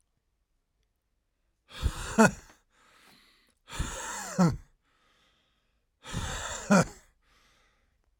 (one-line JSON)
{"exhalation_length": "8.2 s", "exhalation_amplitude": 16999, "exhalation_signal_mean_std_ratio": 0.3, "survey_phase": "alpha (2021-03-01 to 2021-08-12)", "age": "45-64", "gender": "Male", "wearing_mask": "No", "symptom_fatigue": true, "symptom_headache": true, "symptom_change_to_sense_of_smell_or_taste": true, "symptom_loss_of_taste": true, "smoker_status": "Current smoker (1 to 10 cigarettes per day)", "respiratory_condition_asthma": false, "respiratory_condition_other": false, "recruitment_source": "Test and Trace", "submission_delay": "2 days", "covid_test_result": "Positive", "covid_test_method": "RT-qPCR", "covid_ct_value": 16.2, "covid_ct_gene": "ORF1ab gene", "covid_ct_mean": 16.8, "covid_viral_load": "3100000 copies/ml", "covid_viral_load_category": "High viral load (>1M copies/ml)"}